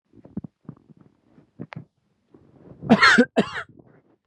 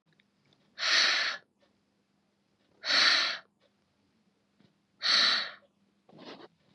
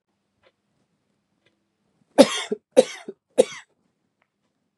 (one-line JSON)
{"cough_length": "4.3 s", "cough_amplitude": 28222, "cough_signal_mean_std_ratio": 0.28, "exhalation_length": "6.7 s", "exhalation_amplitude": 11619, "exhalation_signal_mean_std_ratio": 0.4, "three_cough_length": "4.8 s", "three_cough_amplitude": 32768, "three_cough_signal_mean_std_ratio": 0.18, "survey_phase": "beta (2021-08-13 to 2022-03-07)", "age": "18-44", "gender": "Male", "wearing_mask": "No", "symptom_none": true, "smoker_status": "Never smoked", "respiratory_condition_asthma": false, "respiratory_condition_other": false, "recruitment_source": "REACT", "submission_delay": "1 day", "covid_test_result": "Negative", "covid_test_method": "RT-qPCR", "influenza_a_test_result": "Negative", "influenza_b_test_result": "Negative"}